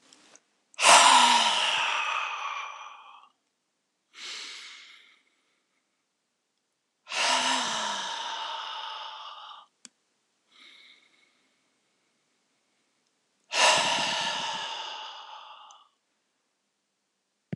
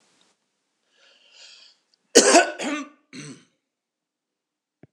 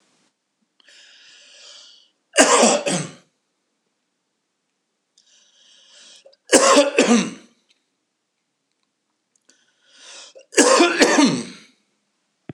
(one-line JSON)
{"exhalation_length": "17.6 s", "exhalation_amplitude": 23596, "exhalation_signal_mean_std_ratio": 0.39, "cough_length": "4.9 s", "cough_amplitude": 26028, "cough_signal_mean_std_ratio": 0.24, "three_cough_length": "12.5 s", "three_cough_amplitude": 26028, "three_cough_signal_mean_std_ratio": 0.34, "survey_phase": "beta (2021-08-13 to 2022-03-07)", "age": "45-64", "gender": "Male", "wearing_mask": "No", "symptom_none": true, "smoker_status": "Never smoked", "respiratory_condition_asthma": false, "respiratory_condition_other": false, "recruitment_source": "REACT", "submission_delay": "2 days", "covid_test_result": "Negative", "covid_test_method": "RT-qPCR"}